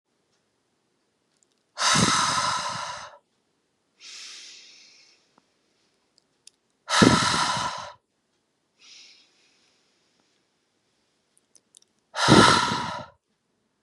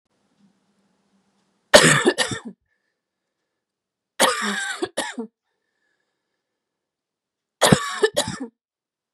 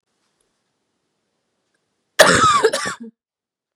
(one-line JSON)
{"exhalation_length": "13.8 s", "exhalation_amplitude": 29176, "exhalation_signal_mean_std_ratio": 0.33, "three_cough_length": "9.1 s", "three_cough_amplitude": 32768, "three_cough_signal_mean_std_ratio": 0.3, "cough_length": "3.8 s", "cough_amplitude": 32768, "cough_signal_mean_std_ratio": 0.33, "survey_phase": "beta (2021-08-13 to 2022-03-07)", "age": "18-44", "gender": "Female", "wearing_mask": "No", "symptom_cough_any": true, "symptom_runny_or_blocked_nose": true, "symptom_sore_throat": true, "symptom_fatigue": true, "symptom_fever_high_temperature": true, "symptom_headache": true, "symptom_onset": "4 days", "smoker_status": "Never smoked", "respiratory_condition_asthma": false, "respiratory_condition_other": false, "recruitment_source": "Test and Trace", "submission_delay": "1 day", "covid_test_result": "Negative", "covid_test_method": "RT-qPCR"}